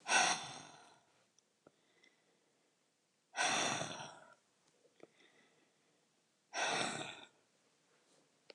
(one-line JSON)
{"exhalation_length": "8.5 s", "exhalation_amplitude": 3878, "exhalation_signal_mean_std_ratio": 0.35, "survey_phase": "beta (2021-08-13 to 2022-03-07)", "age": "65+", "gender": "Female", "wearing_mask": "No", "symptom_cough_any": true, "symptom_new_continuous_cough": true, "symptom_runny_or_blocked_nose": true, "symptom_fatigue": true, "symptom_headache": true, "symptom_change_to_sense_of_smell_or_taste": true, "symptom_loss_of_taste": true, "symptom_other": true, "symptom_onset": "6 days", "smoker_status": "Ex-smoker", "respiratory_condition_asthma": true, "respiratory_condition_other": false, "recruitment_source": "REACT", "submission_delay": "0 days", "covid_test_result": "Negative", "covid_test_method": "RT-qPCR", "influenza_a_test_result": "Negative", "influenza_b_test_result": "Negative"}